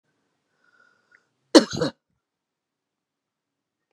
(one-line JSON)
{"cough_length": "3.9 s", "cough_amplitude": 32732, "cough_signal_mean_std_ratio": 0.15, "survey_phase": "beta (2021-08-13 to 2022-03-07)", "age": "65+", "gender": "Female", "wearing_mask": "No", "symptom_none": true, "smoker_status": "Ex-smoker", "respiratory_condition_asthma": false, "respiratory_condition_other": false, "recruitment_source": "REACT", "submission_delay": "2 days", "covid_test_result": "Negative", "covid_test_method": "RT-qPCR", "influenza_a_test_result": "Unknown/Void", "influenza_b_test_result": "Unknown/Void"}